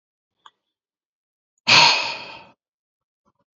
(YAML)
exhalation_length: 3.6 s
exhalation_amplitude: 29960
exhalation_signal_mean_std_ratio: 0.27
survey_phase: alpha (2021-03-01 to 2021-08-12)
age: 45-64
gender: Male
wearing_mask: 'No'
symptom_new_continuous_cough: true
symptom_shortness_of_breath: true
symptom_headache: true
symptom_change_to_sense_of_smell_or_taste: true
symptom_loss_of_taste: true
symptom_onset: 3 days
smoker_status: Never smoked
respiratory_condition_asthma: false
respiratory_condition_other: false
recruitment_source: Test and Trace
submission_delay: 1 day
covid_test_result: Positive
covid_test_method: RT-qPCR
covid_ct_value: 18.5
covid_ct_gene: ORF1ab gene
covid_ct_mean: 19.3
covid_viral_load: 480000 copies/ml
covid_viral_load_category: Low viral load (10K-1M copies/ml)